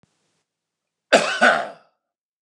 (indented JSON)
{
  "cough_length": "2.4 s",
  "cough_amplitude": 29204,
  "cough_signal_mean_std_ratio": 0.33,
  "survey_phase": "beta (2021-08-13 to 2022-03-07)",
  "age": "45-64",
  "gender": "Male",
  "wearing_mask": "No",
  "symptom_none": true,
  "smoker_status": "Ex-smoker",
  "respiratory_condition_asthma": false,
  "respiratory_condition_other": false,
  "recruitment_source": "REACT",
  "submission_delay": "0 days",
  "covid_test_result": "Negative",
  "covid_test_method": "RT-qPCR",
  "influenza_a_test_result": "Negative",
  "influenza_b_test_result": "Negative"
}